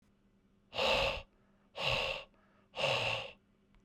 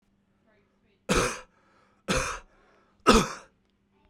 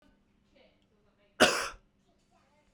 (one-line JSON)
{"exhalation_length": "3.8 s", "exhalation_amplitude": 4184, "exhalation_signal_mean_std_ratio": 0.52, "three_cough_length": "4.1 s", "three_cough_amplitude": 23597, "three_cough_signal_mean_std_ratio": 0.31, "cough_length": "2.7 s", "cough_amplitude": 14890, "cough_signal_mean_std_ratio": 0.23, "survey_phase": "beta (2021-08-13 to 2022-03-07)", "age": "18-44", "gender": "Male", "wearing_mask": "No", "symptom_cough_any": true, "symptom_runny_or_blocked_nose": true, "symptom_fatigue": true, "symptom_headache": true, "symptom_onset": "3 days", "smoker_status": "Never smoked", "respiratory_condition_asthma": false, "respiratory_condition_other": false, "recruitment_source": "Test and Trace", "submission_delay": "2 days", "covid_test_result": "Positive", "covid_test_method": "RT-qPCR", "covid_ct_value": 19.8, "covid_ct_gene": "ORF1ab gene", "covid_ct_mean": 20.5, "covid_viral_load": "190000 copies/ml", "covid_viral_load_category": "Low viral load (10K-1M copies/ml)"}